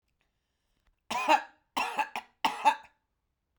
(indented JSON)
{
  "three_cough_length": "3.6 s",
  "three_cough_amplitude": 9773,
  "three_cough_signal_mean_std_ratio": 0.35,
  "survey_phase": "beta (2021-08-13 to 2022-03-07)",
  "age": "45-64",
  "gender": "Female",
  "wearing_mask": "No",
  "symptom_shortness_of_breath": true,
  "symptom_onset": "9 days",
  "smoker_status": "Never smoked",
  "respiratory_condition_asthma": false,
  "respiratory_condition_other": false,
  "recruitment_source": "REACT",
  "submission_delay": "2 days",
  "covid_test_result": "Negative",
  "covid_test_method": "RT-qPCR",
  "influenza_a_test_result": "Negative",
  "influenza_b_test_result": "Negative"
}